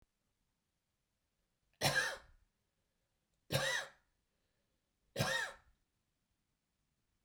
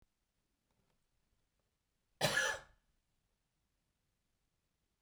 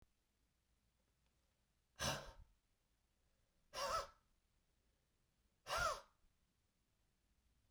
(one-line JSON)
{"three_cough_length": "7.2 s", "three_cough_amplitude": 3411, "three_cough_signal_mean_std_ratio": 0.3, "cough_length": "5.0 s", "cough_amplitude": 3860, "cough_signal_mean_std_ratio": 0.22, "exhalation_length": "7.7 s", "exhalation_amplitude": 1372, "exhalation_signal_mean_std_ratio": 0.29, "survey_phase": "beta (2021-08-13 to 2022-03-07)", "age": "65+", "gender": "Male", "wearing_mask": "No", "symptom_none": true, "smoker_status": "Never smoked", "respiratory_condition_asthma": false, "respiratory_condition_other": false, "recruitment_source": "REACT", "submission_delay": "1 day", "covid_test_result": "Negative", "covid_test_method": "RT-qPCR"}